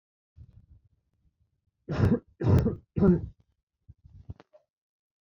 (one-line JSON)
{"three_cough_length": "5.2 s", "three_cough_amplitude": 9805, "three_cough_signal_mean_std_ratio": 0.33, "survey_phase": "beta (2021-08-13 to 2022-03-07)", "age": "18-44", "gender": "Male", "wearing_mask": "No", "symptom_cough_any": true, "symptom_runny_or_blocked_nose": true, "symptom_sore_throat": true, "smoker_status": "Never smoked", "respiratory_condition_asthma": false, "respiratory_condition_other": false, "recruitment_source": "Test and Trace", "submission_delay": "1 day", "covid_test_result": "Positive", "covid_test_method": "RT-qPCR", "covid_ct_value": 23.2, "covid_ct_gene": "N gene"}